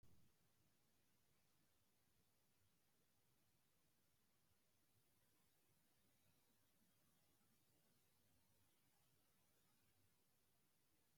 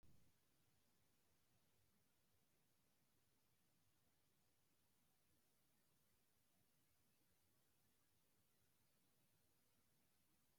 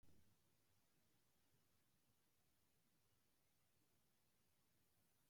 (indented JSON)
{
  "exhalation_length": "11.2 s",
  "exhalation_amplitude": 33,
  "exhalation_signal_mean_std_ratio": 1.01,
  "three_cough_length": "10.6 s",
  "three_cough_amplitude": 33,
  "three_cough_signal_mean_std_ratio": 0.99,
  "cough_length": "5.3 s",
  "cough_amplitude": 33,
  "cough_signal_mean_std_ratio": 0.89,
  "survey_phase": "beta (2021-08-13 to 2022-03-07)",
  "age": "65+",
  "gender": "Male",
  "wearing_mask": "No",
  "symptom_none": true,
  "smoker_status": "Never smoked",
  "respiratory_condition_asthma": false,
  "respiratory_condition_other": false,
  "recruitment_source": "REACT",
  "submission_delay": "2 days",
  "covid_test_result": "Negative",
  "covid_test_method": "RT-qPCR",
  "influenza_a_test_result": "Negative",
  "influenza_b_test_result": "Negative"
}